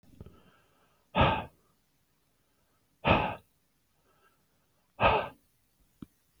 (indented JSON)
{
  "exhalation_length": "6.4 s",
  "exhalation_amplitude": 11533,
  "exhalation_signal_mean_std_ratio": 0.29,
  "survey_phase": "beta (2021-08-13 to 2022-03-07)",
  "age": "45-64",
  "gender": "Male",
  "wearing_mask": "No",
  "symptom_none": true,
  "smoker_status": "Ex-smoker",
  "respiratory_condition_asthma": false,
  "respiratory_condition_other": false,
  "recruitment_source": "REACT",
  "submission_delay": "3 days",
  "covid_test_result": "Negative",
  "covid_test_method": "RT-qPCR",
  "influenza_a_test_result": "Negative",
  "influenza_b_test_result": "Negative"
}